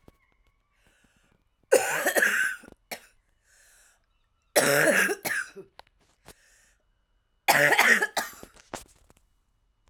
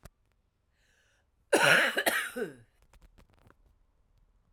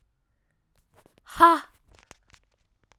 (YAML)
three_cough_length: 9.9 s
three_cough_amplitude: 17516
three_cough_signal_mean_std_ratio: 0.38
cough_length: 4.5 s
cough_amplitude: 11641
cough_signal_mean_std_ratio: 0.33
exhalation_length: 3.0 s
exhalation_amplitude: 23461
exhalation_signal_mean_std_ratio: 0.2
survey_phase: alpha (2021-03-01 to 2021-08-12)
age: 45-64
gender: Female
wearing_mask: 'No'
symptom_cough_any: true
symptom_shortness_of_breath: true
symptom_abdominal_pain: true
symptom_diarrhoea: true
symptom_fatigue: true
symptom_headache: true
symptom_onset: 2 days
smoker_status: Ex-smoker
respiratory_condition_asthma: false
respiratory_condition_other: false
recruitment_source: Test and Trace
submission_delay: 1 day
covid_test_result: Positive
covid_test_method: RT-qPCR